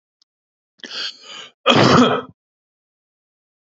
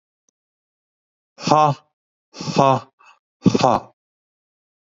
{
  "cough_length": "3.8 s",
  "cough_amplitude": 28206,
  "cough_signal_mean_std_ratio": 0.34,
  "exhalation_length": "4.9 s",
  "exhalation_amplitude": 32768,
  "exhalation_signal_mean_std_ratio": 0.31,
  "survey_phase": "beta (2021-08-13 to 2022-03-07)",
  "age": "45-64",
  "gender": "Male",
  "wearing_mask": "No",
  "symptom_shortness_of_breath": true,
  "symptom_onset": "3 days",
  "smoker_status": "Never smoked",
  "respiratory_condition_asthma": false,
  "respiratory_condition_other": false,
  "recruitment_source": "REACT",
  "submission_delay": "1 day",
  "covid_test_result": "Negative",
  "covid_test_method": "RT-qPCR",
  "influenza_a_test_result": "Negative",
  "influenza_b_test_result": "Negative"
}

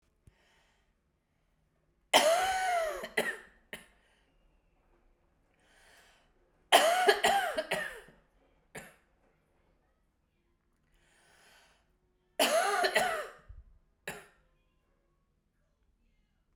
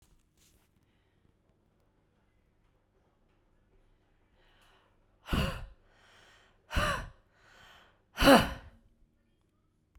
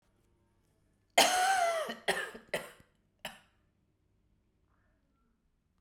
{
  "three_cough_length": "16.6 s",
  "three_cough_amplitude": 12995,
  "three_cough_signal_mean_std_ratio": 0.34,
  "exhalation_length": "10.0 s",
  "exhalation_amplitude": 13846,
  "exhalation_signal_mean_std_ratio": 0.21,
  "cough_length": "5.8 s",
  "cough_amplitude": 10254,
  "cough_signal_mean_std_ratio": 0.33,
  "survey_phase": "beta (2021-08-13 to 2022-03-07)",
  "age": "45-64",
  "gender": "Female",
  "wearing_mask": "No",
  "symptom_cough_any": true,
  "symptom_sore_throat": true,
  "symptom_fatigue": true,
  "symptom_headache": true,
  "symptom_change_to_sense_of_smell_or_taste": true,
  "symptom_onset": "4 days",
  "smoker_status": "Ex-smoker",
  "respiratory_condition_asthma": false,
  "respiratory_condition_other": false,
  "recruitment_source": "Test and Trace",
  "submission_delay": "1 day",
  "covid_test_result": "Positive",
  "covid_test_method": "ePCR"
}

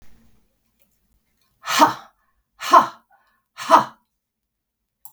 {
  "exhalation_length": "5.1 s",
  "exhalation_amplitude": 32768,
  "exhalation_signal_mean_std_ratio": 0.25,
  "survey_phase": "beta (2021-08-13 to 2022-03-07)",
  "age": "45-64",
  "gender": "Female",
  "wearing_mask": "No",
  "symptom_none": true,
  "smoker_status": "Ex-smoker",
  "respiratory_condition_asthma": false,
  "respiratory_condition_other": false,
  "recruitment_source": "REACT",
  "submission_delay": "2 days",
  "covid_test_result": "Negative",
  "covid_test_method": "RT-qPCR",
  "influenza_a_test_result": "Negative",
  "influenza_b_test_result": "Negative"
}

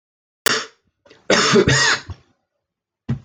{
  "cough_length": "3.2 s",
  "cough_amplitude": 27666,
  "cough_signal_mean_std_ratio": 0.45,
  "survey_phase": "alpha (2021-03-01 to 2021-08-12)",
  "age": "45-64",
  "gender": "Male",
  "wearing_mask": "No",
  "symptom_none": true,
  "smoker_status": "Never smoked",
  "respiratory_condition_asthma": false,
  "respiratory_condition_other": false,
  "recruitment_source": "REACT",
  "submission_delay": "1 day",
  "covid_test_result": "Negative",
  "covid_test_method": "RT-qPCR"
}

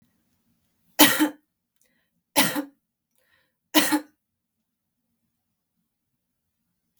{
  "three_cough_length": "7.0 s",
  "three_cough_amplitude": 32766,
  "three_cough_signal_mean_std_ratio": 0.24,
  "survey_phase": "beta (2021-08-13 to 2022-03-07)",
  "age": "45-64",
  "gender": "Female",
  "wearing_mask": "No",
  "symptom_none": true,
  "smoker_status": "Never smoked",
  "respiratory_condition_asthma": false,
  "respiratory_condition_other": false,
  "recruitment_source": "REACT",
  "submission_delay": "1 day",
  "covid_test_result": "Negative",
  "covid_test_method": "RT-qPCR",
  "influenza_a_test_result": "Negative",
  "influenza_b_test_result": "Negative"
}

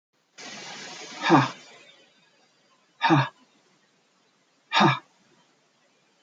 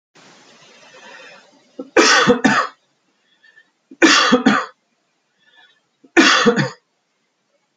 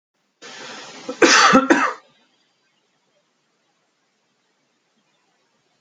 {
  "exhalation_length": "6.2 s",
  "exhalation_amplitude": 22353,
  "exhalation_signal_mean_std_ratio": 0.31,
  "three_cough_length": "7.8 s",
  "three_cough_amplitude": 29502,
  "three_cough_signal_mean_std_ratio": 0.39,
  "cough_length": "5.8 s",
  "cough_amplitude": 31424,
  "cough_signal_mean_std_ratio": 0.29,
  "survey_phase": "beta (2021-08-13 to 2022-03-07)",
  "age": "45-64",
  "gender": "Male",
  "wearing_mask": "No",
  "symptom_none": true,
  "smoker_status": "Ex-smoker",
  "respiratory_condition_asthma": false,
  "respiratory_condition_other": false,
  "recruitment_source": "REACT",
  "submission_delay": "1 day",
  "covid_test_result": "Negative",
  "covid_test_method": "RT-qPCR"
}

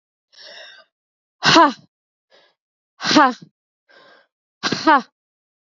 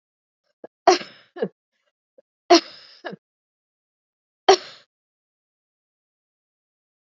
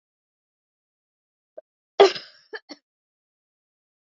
{
  "exhalation_length": "5.6 s",
  "exhalation_amplitude": 32767,
  "exhalation_signal_mean_std_ratio": 0.3,
  "three_cough_length": "7.2 s",
  "three_cough_amplitude": 30174,
  "three_cough_signal_mean_std_ratio": 0.17,
  "cough_length": "4.0 s",
  "cough_amplitude": 27535,
  "cough_signal_mean_std_ratio": 0.15,
  "survey_phase": "beta (2021-08-13 to 2022-03-07)",
  "age": "45-64",
  "gender": "Female",
  "wearing_mask": "No",
  "symptom_cough_any": true,
  "symptom_runny_or_blocked_nose": true,
  "symptom_fatigue": true,
  "symptom_fever_high_temperature": true,
  "symptom_headache": true,
  "symptom_change_to_sense_of_smell_or_taste": true,
  "symptom_loss_of_taste": true,
  "symptom_onset": "8 days",
  "smoker_status": "Never smoked",
  "respiratory_condition_asthma": true,
  "respiratory_condition_other": false,
  "recruitment_source": "Test and Trace",
  "submission_delay": "1 day",
  "covid_test_result": "Positive",
  "covid_test_method": "RT-qPCR"
}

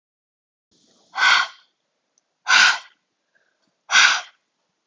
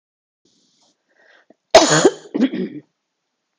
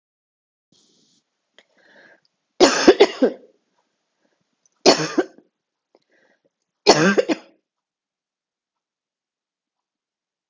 {
  "exhalation_length": "4.9 s",
  "exhalation_amplitude": 28774,
  "exhalation_signal_mean_std_ratio": 0.34,
  "cough_length": "3.6 s",
  "cough_amplitude": 32768,
  "cough_signal_mean_std_ratio": 0.3,
  "three_cough_length": "10.5 s",
  "three_cough_amplitude": 32768,
  "three_cough_signal_mean_std_ratio": 0.24,
  "survey_phase": "beta (2021-08-13 to 2022-03-07)",
  "age": "45-64",
  "gender": "Female",
  "wearing_mask": "No",
  "symptom_cough_any": true,
  "symptom_fatigue": true,
  "symptom_change_to_sense_of_smell_or_taste": true,
  "symptom_loss_of_taste": true,
  "symptom_other": true,
  "symptom_onset": "7 days",
  "smoker_status": "Never smoked",
  "respiratory_condition_asthma": false,
  "respiratory_condition_other": false,
  "recruitment_source": "Test and Trace",
  "submission_delay": "2 days",
  "covid_test_method": "RT-qPCR",
  "covid_ct_value": 26.8,
  "covid_ct_gene": "ORF1ab gene"
}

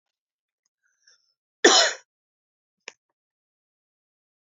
{
  "cough_length": "4.4 s",
  "cough_amplitude": 27139,
  "cough_signal_mean_std_ratio": 0.19,
  "survey_phase": "beta (2021-08-13 to 2022-03-07)",
  "age": "45-64",
  "gender": "Female",
  "wearing_mask": "No",
  "symptom_new_continuous_cough": true,
  "symptom_runny_or_blocked_nose": true,
  "symptom_fatigue": true,
  "symptom_headache": true,
  "symptom_change_to_sense_of_smell_or_taste": true,
  "symptom_loss_of_taste": true,
  "symptom_onset": "3 days",
  "smoker_status": "Never smoked",
  "respiratory_condition_asthma": false,
  "respiratory_condition_other": false,
  "recruitment_source": "Test and Trace",
  "submission_delay": "2 days",
  "covid_test_result": "Positive",
  "covid_test_method": "RT-qPCR"
}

